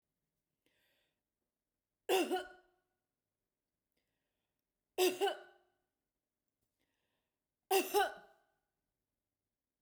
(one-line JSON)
{"three_cough_length": "9.8 s", "three_cough_amplitude": 3946, "three_cough_signal_mean_std_ratio": 0.25, "survey_phase": "beta (2021-08-13 to 2022-03-07)", "age": "45-64", "gender": "Female", "wearing_mask": "No", "symptom_none": true, "smoker_status": "Ex-smoker", "respiratory_condition_asthma": false, "respiratory_condition_other": false, "recruitment_source": "REACT", "submission_delay": "2 days", "covid_test_result": "Negative", "covid_test_method": "RT-qPCR", "influenza_a_test_result": "Negative", "influenza_b_test_result": "Negative"}